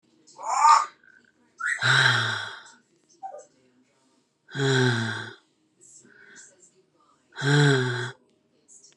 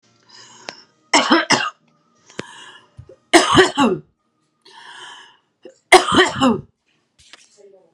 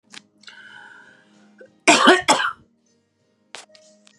{"exhalation_length": "9.0 s", "exhalation_amplitude": 19623, "exhalation_signal_mean_std_ratio": 0.44, "three_cough_length": "7.9 s", "three_cough_amplitude": 32768, "three_cough_signal_mean_std_ratio": 0.35, "cough_length": "4.2 s", "cough_amplitude": 32767, "cough_signal_mean_std_ratio": 0.29, "survey_phase": "beta (2021-08-13 to 2022-03-07)", "age": "45-64", "gender": "Female", "wearing_mask": "No", "symptom_cough_any": true, "smoker_status": "Current smoker (1 to 10 cigarettes per day)", "respiratory_condition_asthma": false, "respiratory_condition_other": false, "recruitment_source": "REACT", "submission_delay": "1 day", "covid_test_result": "Negative", "covid_test_method": "RT-qPCR", "influenza_a_test_result": "Negative", "influenza_b_test_result": "Negative"}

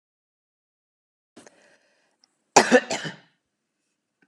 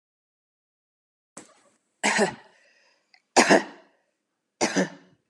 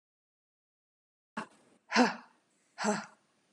{"cough_length": "4.3 s", "cough_amplitude": 32170, "cough_signal_mean_std_ratio": 0.19, "three_cough_length": "5.3 s", "three_cough_amplitude": 31718, "three_cough_signal_mean_std_ratio": 0.29, "exhalation_length": "3.5 s", "exhalation_amplitude": 7844, "exhalation_signal_mean_std_ratio": 0.27, "survey_phase": "beta (2021-08-13 to 2022-03-07)", "age": "18-44", "gender": "Female", "wearing_mask": "No", "symptom_cough_any": true, "symptom_runny_or_blocked_nose": true, "smoker_status": "Never smoked", "respiratory_condition_asthma": false, "respiratory_condition_other": false, "recruitment_source": "Test and Trace", "submission_delay": "2 days", "covid_test_result": "Positive", "covid_test_method": "RT-qPCR", "covid_ct_value": 28.1, "covid_ct_gene": "ORF1ab gene"}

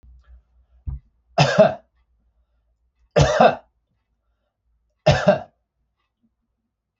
{"three_cough_length": "7.0 s", "three_cough_amplitude": 27315, "three_cough_signal_mean_std_ratio": 0.3, "survey_phase": "beta (2021-08-13 to 2022-03-07)", "age": "45-64", "gender": "Male", "wearing_mask": "No", "symptom_none": true, "smoker_status": "Never smoked", "respiratory_condition_asthma": false, "respiratory_condition_other": false, "recruitment_source": "REACT", "submission_delay": "0 days", "covid_test_result": "Negative", "covid_test_method": "RT-qPCR"}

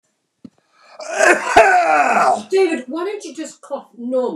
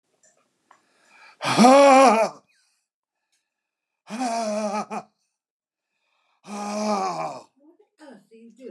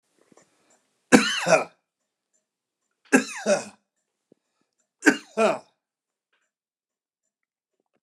{"cough_length": "4.4 s", "cough_amplitude": 29204, "cough_signal_mean_std_ratio": 0.63, "exhalation_length": "8.7 s", "exhalation_amplitude": 25693, "exhalation_signal_mean_std_ratio": 0.37, "three_cough_length": "8.0 s", "three_cough_amplitude": 29204, "three_cough_signal_mean_std_ratio": 0.26, "survey_phase": "alpha (2021-03-01 to 2021-08-12)", "age": "65+", "gender": "Male", "wearing_mask": "No", "symptom_none": true, "smoker_status": "Never smoked", "respiratory_condition_asthma": false, "respiratory_condition_other": false, "recruitment_source": "REACT", "submission_delay": "8 days", "covid_test_result": "Negative", "covid_test_method": "RT-qPCR"}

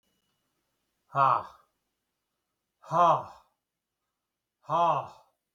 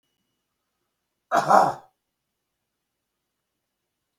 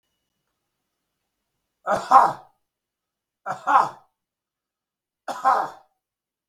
{"exhalation_length": "5.5 s", "exhalation_amplitude": 9790, "exhalation_signal_mean_std_ratio": 0.32, "cough_length": "4.2 s", "cough_amplitude": 27592, "cough_signal_mean_std_ratio": 0.23, "three_cough_length": "6.5 s", "three_cough_amplitude": 32766, "three_cough_signal_mean_std_ratio": 0.27, "survey_phase": "beta (2021-08-13 to 2022-03-07)", "age": "65+", "gender": "Male", "wearing_mask": "No", "symptom_none": true, "smoker_status": "Never smoked", "respiratory_condition_asthma": false, "respiratory_condition_other": false, "recruitment_source": "REACT", "submission_delay": "3 days", "covid_test_result": "Negative", "covid_test_method": "RT-qPCR", "influenza_a_test_result": "Negative", "influenza_b_test_result": "Negative"}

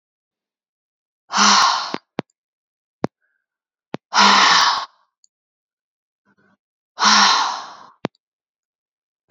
{"exhalation_length": "9.3 s", "exhalation_amplitude": 29625, "exhalation_signal_mean_std_ratio": 0.36, "survey_phase": "beta (2021-08-13 to 2022-03-07)", "age": "45-64", "gender": "Female", "wearing_mask": "No", "symptom_none": true, "smoker_status": "Never smoked", "respiratory_condition_asthma": false, "respiratory_condition_other": false, "recruitment_source": "REACT", "submission_delay": "2 days", "covid_test_result": "Negative", "covid_test_method": "RT-qPCR", "influenza_a_test_result": "Unknown/Void", "influenza_b_test_result": "Unknown/Void"}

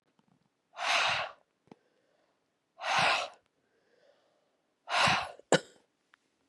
{"exhalation_length": "6.5 s", "exhalation_amplitude": 11324, "exhalation_signal_mean_std_ratio": 0.37, "survey_phase": "beta (2021-08-13 to 2022-03-07)", "age": "18-44", "gender": "Female", "wearing_mask": "No", "symptom_new_continuous_cough": true, "symptom_runny_or_blocked_nose": true, "symptom_shortness_of_breath": true, "symptom_sore_throat": true, "symptom_headache": true, "symptom_other": true, "smoker_status": "Ex-smoker", "respiratory_condition_asthma": false, "respiratory_condition_other": false, "recruitment_source": "Test and Trace", "submission_delay": "1 day", "covid_test_result": "Positive", "covid_test_method": "LFT"}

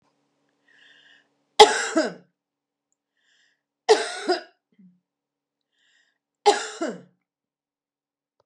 {"three_cough_length": "8.5 s", "three_cough_amplitude": 32768, "three_cough_signal_mean_std_ratio": 0.22, "survey_phase": "beta (2021-08-13 to 2022-03-07)", "age": "65+", "gender": "Female", "wearing_mask": "No", "symptom_none": true, "smoker_status": "Never smoked", "respiratory_condition_asthma": false, "respiratory_condition_other": false, "recruitment_source": "REACT", "submission_delay": "1 day", "covid_test_result": "Negative", "covid_test_method": "RT-qPCR", "influenza_a_test_result": "Negative", "influenza_b_test_result": "Negative"}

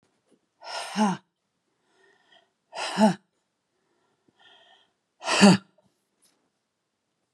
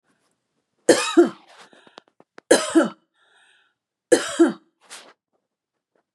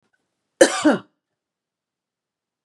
{"exhalation_length": "7.3 s", "exhalation_amplitude": 26861, "exhalation_signal_mean_std_ratio": 0.25, "three_cough_length": "6.1 s", "three_cough_amplitude": 30519, "three_cough_signal_mean_std_ratio": 0.29, "cough_length": "2.6 s", "cough_amplitude": 32768, "cough_signal_mean_std_ratio": 0.24, "survey_phase": "beta (2021-08-13 to 2022-03-07)", "age": "45-64", "gender": "Female", "wearing_mask": "No", "symptom_none": true, "smoker_status": "Never smoked", "respiratory_condition_asthma": false, "respiratory_condition_other": false, "recruitment_source": "REACT", "submission_delay": "1 day", "covid_test_result": "Negative", "covid_test_method": "RT-qPCR", "influenza_a_test_result": "Negative", "influenza_b_test_result": "Negative"}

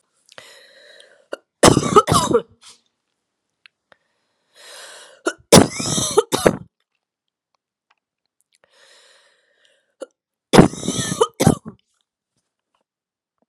{"three_cough_length": "13.5 s", "three_cough_amplitude": 32768, "three_cough_signal_mean_std_ratio": 0.27, "survey_phase": "alpha (2021-03-01 to 2021-08-12)", "age": "45-64", "gender": "Female", "wearing_mask": "No", "symptom_cough_any": true, "symptom_shortness_of_breath": true, "symptom_fatigue": true, "symptom_fever_high_temperature": true, "symptom_headache": true, "symptom_change_to_sense_of_smell_or_taste": true, "symptom_loss_of_taste": true, "smoker_status": "Never smoked", "respiratory_condition_asthma": true, "respiratory_condition_other": false, "recruitment_source": "Test and Trace", "submission_delay": "1 day", "covid_test_result": "Positive", "covid_test_method": "RT-qPCR"}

